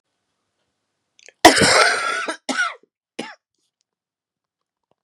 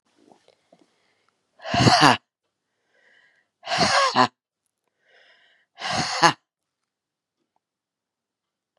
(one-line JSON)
{"cough_length": "5.0 s", "cough_amplitude": 32768, "cough_signal_mean_std_ratio": 0.32, "exhalation_length": "8.8 s", "exhalation_amplitude": 32767, "exhalation_signal_mean_std_ratio": 0.29, "survey_phase": "beta (2021-08-13 to 2022-03-07)", "age": "65+", "gender": "Female", "wearing_mask": "No", "symptom_cough_any": true, "symptom_new_continuous_cough": true, "symptom_runny_or_blocked_nose": true, "symptom_sore_throat": true, "symptom_fatigue": true, "symptom_change_to_sense_of_smell_or_taste": true, "symptom_onset": "6 days", "smoker_status": "Never smoked", "respiratory_condition_asthma": false, "respiratory_condition_other": false, "recruitment_source": "Test and Trace", "submission_delay": "2 days", "covid_test_result": "Positive", "covid_test_method": "RT-qPCR", "covid_ct_value": 15.9, "covid_ct_gene": "ORF1ab gene", "covid_ct_mean": 17.1, "covid_viral_load": "2400000 copies/ml", "covid_viral_load_category": "High viral load (>1M copies/ml)"}